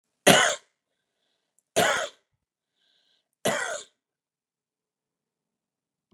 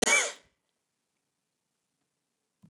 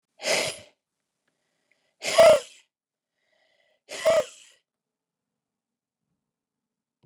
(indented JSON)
{
  "three_cough_length": "6.1 s",
  "three_cough_amplitude": 28992,
  "three_cough_signal_mean_std_ratio": 0.26,
  "cough_length": "2.7 s",
  "cough_amplitude": 7845,
  "cough_signal_mean_std_ratio": 0.25,
  "exhalation_length": "7.1 s",
  "exhalation_amplitude": 17756,
  "exhalation_signal_mean_std_ratio": 0.25,
  "survey_phase": "beta (2021-08-13 to 2022-03-07)",
  "age": "45-64",
  "gender": "Male",
  "wearing_mask": "No",
  "symptom_none": true,
  "smoker_status": "Never smoked",
  "respiratory_condition_asthma": false,
  "respiratory_condition_other": false,
  "recruitment_source": "REACT",
  "submission_delay": "0 days",
  "covid_test_result": "Negative",
  "covid_test_method": "RT-qPCR"
}